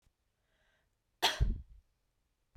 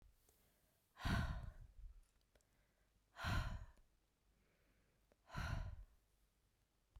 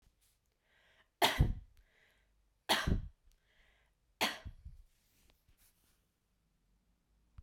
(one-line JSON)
{"cough_length": "2.6 s", "cough_amplitude": 5475, "cough_signal_mean_std_ratio": 0.28, "exhalation_length": "7.0 s", "exhalation_amplitude": 1076, "exhalation_signal_mean_std_ratio": 0.4, "three_cough_length": "7.4 s", "three_cough_amplitude": 5998, "three_cough_signal_mean_std_ratio": 0.27, "survey_phase": "beta (2021-08-13 to 2022-03-07)", "age": "18-44", "gender": "Female", "wearing_mask": "No", "symptom_none": true, "smoker_status": "Never smoked", "respiratory_condition_asthma": false, "respiratory_condition_other": false, "recruitment_source": "REACT", "submission_delay": "3 days", "covid_test_result": "Negative", "covid_test_method": "RT-qPCR"}